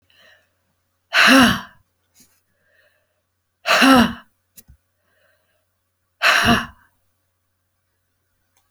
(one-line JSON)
{"exhalation_length": "8.7 s", "exhalation_amplitude": 32767, "exhalation_signal_mean_std_ratio": 0.31, "survey_phase": "beta (2021-08-13 to 2022-03-07)", "age": "65+", "gender": "Female", "wearing_mask": "No", "symptom_runny_or_blocked_nose": true, "symptom_onset": "9 days", "smoker_status": "Ex-smoker", "respiratory_condition_asthma": false, "respiratory_condition_other": false, "recruitment_source": "REACT", "submission_delay": "1 day", "covid_test_result": "Negative", "covid_test_method": "RT-qPCR"}